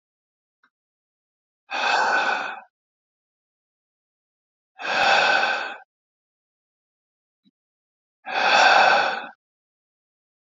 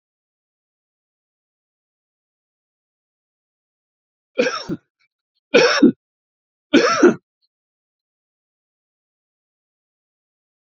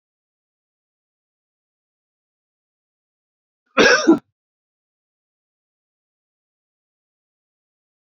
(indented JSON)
{
  "exhalation_length": "10.6 s",
  "exhalation_amplitude": 22594,
  "exhalation_signal_mean_std_ratio": 0.39,
  "three_cough_length": "10.7 s",
  "three_cough_amplitude": 30489,
  "three_cough_signal_mean_std_ratio": 0.23,
  "cough_length": "8.1 s",
  "cough_amplitude": 28739,
  "cough_signal_mean_std_ratio": 0.16,
  "survey_phase": "beta (2021-08-13 to 2022-03-07)",
  "age": "18-44",
  "gender": "Male",
  "wearing_mask": "No",
  "symptom_other": true,
  "smoker_status": "Ex-smoker",
  "respiratory_condition_asthma": false,
  "respiratory_condition_other": false,
  "recruitment_source": "REACT",
  "submission_delay": "1 day",
  "covid_test_result": "Negative",
  "covid_test_method": "RT-qPCR",
  "influenza_a_test_result": "Negative",
  "influenza_b_test_result": "Negative"
}